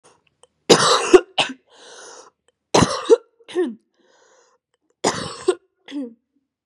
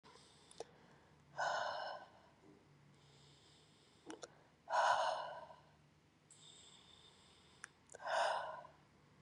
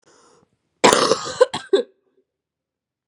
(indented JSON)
{
  "three_cough_length": "6.7 s",
  "three_cough_amplitude": 32768,
  "three_cough_signal_mean_std_ratio": 0.33,
  "exhalation_length": "9.2 s",
  "exhalation_amplitude": 2571,
  "exhalation_signal_mean_std_ratio": 0.41,
  "cough_length": "3.1 s",
  "cough_amplitude": 32768,
  "cough_signal_mean_std_ratio": 0.32,
  "survey_phase": "beta (2021-08-13 to 2022-03-07)",
  "age": "18-44",
  "gender": "Female",
  "wearing_mask": "Yes",
  "symptom_cough_any": true,
  "symptom_runny_or_blocked_nose": true,
  "symptom_sore_throat": true,
  "symptom_fatigue": true,
  "symptom_fever_high_temperature": true,
  "symptom_headache": true,
  "smoker_status": "Never smoked",
  "respiratory_condition_asthma": false,
  "respiratory_condition_other": false,
  "recruitment_source": "Test and Trace",
  "submission_delay": "1 day",
  "covid_test_result": "Positive",
  "covid_test_method": "RT-qPCR",
  "covid_ct_value": 33.1,
  "covid_ct_gene": "ORF1ab gene"
}